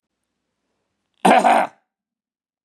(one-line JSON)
{"cough_length": "2.6 s", "cough_amplitude": 32767, "cough_signal_mean_std_ratio": 0.31, "survey_phase": "beta (2021-08-13 to 2022-03-07)", "age": "65+", "gender": "Male", "wearing_mask": "No", "symptom_none": true, "smoker_status": "Ex-smoker", "respiratory_condition_asthma": false, "respiratory_condition_other": false, "recruitment_source": "REACT", "submission_delay": "3 days", "covid_test_result": "Negative", "covid_test_method": "RT-qPCR", "influenza_a_test_result": "Negative", "influenza_b_test_result": "Negative"}